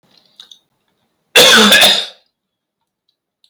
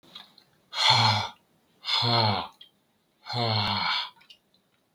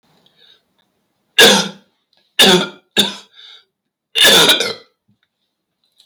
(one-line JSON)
{"cough_length": "3.5 s", "cough_amplitude": 32768, "cough_signal_mean_std_ratio": 0.4, "exhalation_length": "4.9 s", "exhalation_amplitude": 15474, "exhalation_signal_mean_std_ratio": 0.52, "three_cough_length": "6.1 s", "three_cough_amplitude": 32768, "three_cough_signal_mean_std_ratio": 0.39, "survey_phase": "beta (2021-08-13 to 2022-03-07)", "age": "18-44", "gender": "Male", "wearing_mask": "No", "symptom_none": true, "smoker_status": "Never smoked", "respiratory_condition_asthma": false, "respiratory_condition_other": false, "recruitment_source": "REACT", "submission_delay": "0 days", "covid_test_result": "Negative", "covid_test_method": "RT-qPCR", "influenza_a_test_result": "Negative", "influenza_b_test_result": "Negative"}